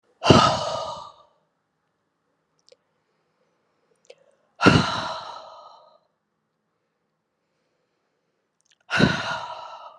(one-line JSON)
{"exhalation_length": "10.0 s", "exhalation_amplitude": 32376, "exhalation_signal_mean_std_ratio": 0.29, "survey_phase": "beta (2021-08-13 to 2022-03-07)", "age": "65+", "gender": "Female", "wearing_mask": "No", "symptom_cough_any": true, "symptom_new_continuous_cough": true, "symptom_runny_or_blocked_nose": true, "symptom_shortness_of_breath": true, "symptom_fatigue": true, "symptom_headache": true, "symptom_other": true, "symptom_onset": "3 days", "smoker_status": "Ex-smoker", "respiratory_condition_asthma": false, "respiratory_condition_other": false, "recruitment_source": "Test and Trace", "submission_delay": "1 day", "covid_test_result": "Positive", "covid_test_method": "RT-qPCR", "covid_ct_value": 17.8, "covid_ct_gene": "ORF1ab gene", "covid_ct_mean": 18.3, "covid_viral_load": "960000 copies/ml", "covid_viral_load_category": "Low viral load (10K-1M copies/ml)"}